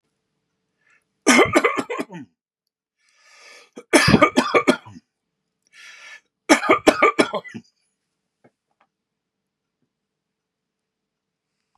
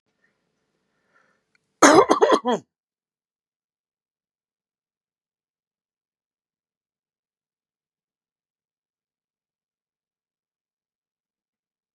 three_cough_length: 11.8 s
three_cough_amplitude: 32767
three_cough_signal_mean_std_ratio: 0.3
cough_length: 11.9 s
cough_amplitude: 32526
cough_signal_mean_std_ratio: 0.16
survey_phase: beta (2021-08-13 to 2022-03-07)
age: 65+
gender: Male
wearing_mask: 'No'
symptom_none: true
smoker_status: Never smoked
respiratory_condition_asthma: false
respiratory_condition_other: false
recruitment_source: REACT
submission_delay: 1 day
covid_test_result: Negative
covid_test_method: RT-qPCR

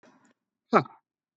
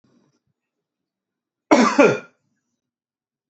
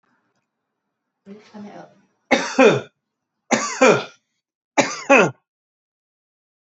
exhalation_length: 1.4 s
exhalation_amplitude: 20484
exhalation_signal_mean_std_ratio: 0.2
cough_length: 3.5 s
cough_amplitude: 28220
cough_signal_mean_std_ratio: 0.27
three_cough_length: 6.7 s
three_cough_amplitude: 28383
three_cough_signal_mean_std_ratio: 0.32
survey_phase: beta (2021-08-13 to 2022-03-07)
age: 45-64
gender: Male
wearing_mask: 'No'
symptom_none: true
smoker_status: Never smoked
respiratory_condition_asthma: false
respiratory_condition_other: false
recruitment_source: REACT
submission_delay: 1 day
covid_test_result: Negative
covid_test_method: RT-qPCR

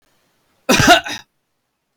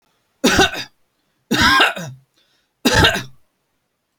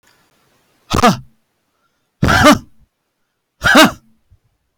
cough_length: 2.0 s
cough_amplitude: 32767
cough_signal_mean_std_ratio: 0.35
three_cough_length: 4.2 s
three_cough_amplitude: 32767
three_cough_signal_mean_std_ratio: 0.43
exhalation_length: 4.8 s
exhalation_amplitude: 32768
exhalation_signal_mean_std_ratio: 0.35
survey_phase: beta (2021-08-13 to 2022-03-07)
age: 45-64
gender: Male
wearing_mask: 'No'
symptom_none: true
smoker_status: Never smoked
respiratory_condition_asthma: false
respiratory_condition_other: false
recruitment_source: REACT
submission_delay: 1 day
covid_test_result: Negative
covid_test_method: RT-qPCR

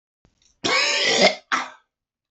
cough_length: 2.3 s
cough_amplitude: 30277
cough_signal_mean_std_ratio: 0.5
survey_phase: beta (2021-08-13 to 2022-03-07)
age: 45-64
gender: Male
wearing_mask: 'No'
symptom_cough_any: true
symptom_runny_or_blocked_nose: true
symptom_shortness_of_breath: true
symptom_abdominal_pain: true
symptom_diarrhoea: true
symptom_fatigue: true
symptom_headache: true
symptom_other: true
smoker_status: Ex-smoker
respiratory_condition_asthma: false
respiratory_condition_other: true
recruitment_source: Test and Trace
submission_delay: 1 day
covid_test_result: Positive
covid_test_method: LFT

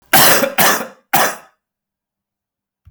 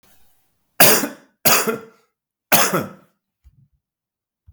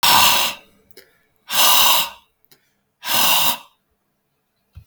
cough_length: 2.9 s
cough_amplitude: 32768
cough_signal_mean_std_ratio: 0.45
three_cough_length: 4.5 s
three_cough_amplitude: 32768
three_cough_signal_mean_std_ratio: 0.34
exhalation_length: 4.9 s
exhalation_amplitude: 32768
exhalation_signal_mean_std_ratio: 0.48
survey_phase: alpha (2021-03-01 to 2021-08-12)
age: 45-64
gender: Male
wearing_mask: 'No'
symptom_abdominal_pain: true
symptom_fatigue: true
symptom_onset: 4 days
smoker_status: Never smoked
respiratory_condition_asthma: false
respiratory_condition_other: false
recruitment_source: Test and Trace
submission_delay: 2 days
covid_test_result: Positive
covid_test_method: RT-qPCR
covid_ct_value: 17.7
covid_ct_gene: ORF1ab gene
covid_ct_mean: 18.7
covid_viral_load: 710000 copies/ml
covid_viral_load_category: Low viral load (10K-1M copies/ml)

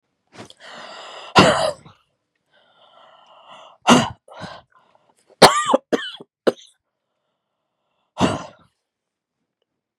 exhalation_length: 10.0 s
exhalation_amplitude: 32768
exhalation_signal_mean_std_ratio: 0.27
survey_phase: beta (2021-08-13 to 2022-03-07)
age: 18-44
gender: Female
wearing_mask: 'No'
symptom_cough_any: true
symptom_sore_throat: true
symptom_fatigue: true
symptom_headache: true
symptom_change_to_sense_of_smell_or_taste: true
symptom_loss_of_taste: true
symptom_onset: 5 days
smoker_status: Never smoked
respiratory_condition_asthma: false
respiratory_condition_other: false
recruitment_source: Test and Trace
submission_delay: 3 days
covid_test_result: Positive
covid_test_method: ePCR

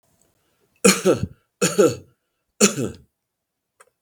three_cough_length: 4.0 s
three_cough_amplitude: 32768
three_cough_signal_mean_std_ratio: 0.34
survey_phase: beta (2021-08-13 to 2022-03-07)
age: 65+
gender: Male
wearing_mask: 'No'
symptom_cough_any: true
symptom_runny_or_blocked_nose: true
symptom_onset: 12 days
smoker_status: Ex-smoker
respiratory_condition_asthma: false
respiratory_condition_other: false
recruitment_source: REACT
submission_delay: 1 day
covid_test_result: Negative
covid_test_method: RT-qPCR
influenza_a_test_result: Negative
influenza_b_test_result: Negative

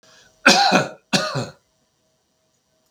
cough_length: 2.9 s
cough_amplitude: 32768
cough_signal_mean_std_ratio: 0.38
survey_phase: beta (2021-08-13 to 2022-03-07)
age: 45-64
gender: Male
wearing_mask: 'No'
symptom_none: true
smoker_status: Ex-smoker
respiratory_condition_asthma: false
respiratory_condition_other: false
recruitment_source: REACT
submission_delay: 5 days
covid_test_result: Negative
covid_test_method: RT-qPCR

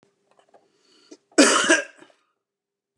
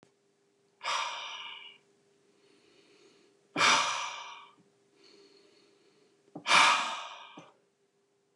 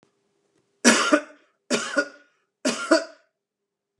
cough_length: 3.0 s
cough_amplitude: 29289
cough_signal_mean_std_ratio: 0.3
exhalation_length: 8.4 s
exhalation_amplitude: 12164
exhalation_signal_mean_std_ratio: 0.34
three_cough_length: 4.0 s
three_cough_amplitude: 29694
three_cough_signal_mean_std_ratio: 0.35
survey_phase: beta (2021-08-13 to 2022-03-07)
age: 45-64
gender: Male
wearing_mask: 'No'
symptom_none: true
smoker_status: Never smoked
respiratory_condition_asthma: false
respiratory_condition_other: false
recruitment_source: REACT
submission_delay: 2 days
covid_test_result: Negative
covid_test_method: RT-qPCR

